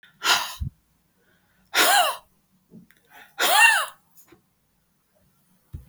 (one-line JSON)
{"exhalation_length": "5.9 s", "exhalation_amplitude": 21692, "exhalation_signal_mean_std_ratio": 0.37, "survey_phase": "beta (2021-08-13 to 2022-03-07)", "age": "45-64", "gender": "Female", "wearing_mask": "No", "symptom_none": true, "smoker_status": "Never smoked", "respiratory_condition_asthma": false, "respiratory_condition_other": false, "recruitment_source": "REACT", "submission_delay": "1 day", "covid_test_result": "Negative", "covid_test_method": "RT-qPCR", "influenza_a_test_result": "Negative", "influenza_b_test_result": "Negative"}